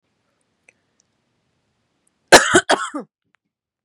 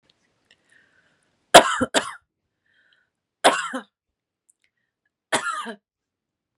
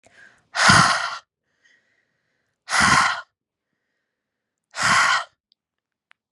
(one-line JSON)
{"cough_length": "3.8 s", "cough_amplitude": 32768, "cough_signal_mean_std_ratio": 0.23, "three_cough_length": "6.6 s", "three_cough_amplitude": 32768, "three_cough_signal_mean_std_ratio": 0.22, "exhalation_length": "6.3 s", "exhalation_amplitude": 29836, "exhalation_signal_mean_std_ratio": 0.39, "survey_phase": "beta (2021-08-13 to 2022-03-07)", "age": "18-44", "gender": "Female", "wearing_mask": "No", "symptom_fatigue": true, "smoker_status": "Never smoked", "respiratory_condition_asthma": false, "respiratory_condition_other": false, "recruitment_source": "REACT", "submission_delay": "1 day", "covid_test_result": "Negative", "covid_test_method": "RT-qPCR", "influenza_a_test_result": "Negative", "influenza_b_test_result": "Negative"}